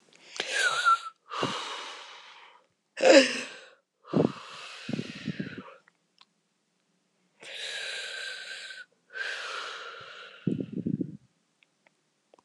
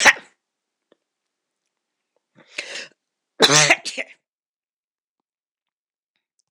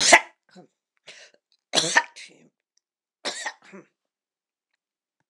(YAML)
exhalation_length: 12.4 s
exhalation_amplitude: 21052
exhalation_signal_mean_std_ratio: 0.38
cough_length: 6.5 s
cough_amplitude: 26028
cough_signal_mean_std_ratio: 0.23
three_cough_length: 5.3 s
three_cough_amplitude: 26028
three_cough_signal_mean_std_ratio: 0.23
survey_phase: alpha (2021-03-01 to 2021-08-12)
age: 45-64
gender: Female
wearing_mask: 'No'
symptom_none: true
symptom_onset: 12 days
smoker_status: Never smoked
respiratory_condition_asthma: false
respiratory_condition_other: false
recruitment_source: REACT
submission_delay: 1 day
covid_test_result: Negative
covid_test_method: RT-qPCR